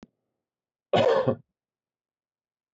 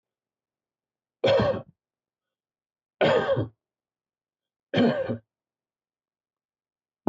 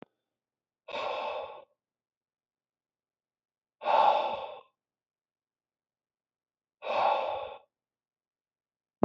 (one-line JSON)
{"cough_length": "2.7 s", "cough_amplitude": 12400, "cough_signal_mean_std_ratio": 0.31, "three_cough_length": "7.1 s", "three_cough_amplitude": 10274, "three_cough_signal_mean_std_ratio": 0.34, "exhalation_length": "9.0 s", "exhalation_amplitude": 12590, "exhalation_signal_mean_std_ratio": 0.33, "survey_phase": "beta (2021-08-13 to 2022-03-07)", "age": "65+", "gender": "Male", "wearing_mask": "No", "symptom_cough_any": true, "smoker_status": "Never smoked", "respiratory_condition_asthma": false, "respiratory_condition_other": false, "recruitment_source": "REACT", "submission_delay": "1 day", "covid_test_result": "Negative", "covid_test_method": "RT-qPCR", "influenza_a_test_result": "Negative", "influenza_b_test_result": "Negative"}